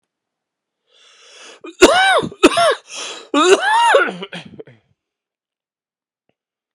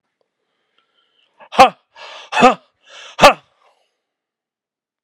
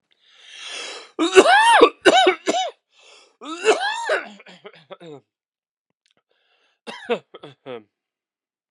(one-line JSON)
{"cough_length": "6.7 s", "cough_amplitude": 32768, "cough_signal_mean_std_ratio": 0.41, "exhalation_length": "5.0 s", "exhalation_amplitude": 32768, "exhalation_signal_mean_std_ratio": 0.23, "three_cough_length": "8.7 s", "three_cough_amplitude": 32768, "three_cough_signal_mean_std_ratio": 0.36, "survey_phase": "alpha (2021-03-01 to 2021-08-12)", "age": "45-64", "gender": "Male", "wearing_mask": "No", "symptom_cough_any": true, "symptom_fatigue": true, "symptom_onset": "2 days", "smoker_status": "Never smoked", "respiratory_condition_asthma": false, "respiratory_condition_other": false, "recruitment_source": "Test and Trace", "submission_delay": "1 day", "covid_test_result": "Positive", "covid_test_method": "RT-qPCR", "covid_ct_value": 14.9, "covid_ct_gene": "ORF1ab gene", "covid_ct_mean": 16.0, "covid_viral_load": "5800000 copies/ml", "covid_viral_load_category": "High viral load (>1M copies/ml)"}